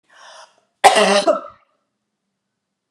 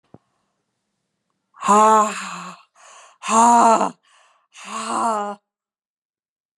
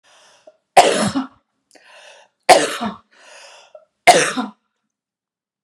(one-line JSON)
{"cough_length": "2.9 s", "cough_amplitude": 32768, "cough_signal_mean_std_ratio": 0.34, "exhalation_length": "6.6 s", "exhalation_amplitude": 26471, "exhalation_signal_mean_std_ratio": 0.41, "three_cough_length": "5.6 s", "three_cough_amplitude": 32768, "three_cough_signal_mean_std_ratio": 0.31, "survey_phase": "beta (2021-08-13 to 2022-03-07)", "age": "18-44", "gender": "Female", "wearing_mask": "No", "symptom_abdominal_pain": true, "smoker_status": "Never smoked", "respiratory_condition_asthma": false, "respiratory_condition_other": false, "recruitment_source": "REACT", "submission_delay": "1 day", "covid_test_result": "Negative", "covid_test_method": "RT-qPCR"}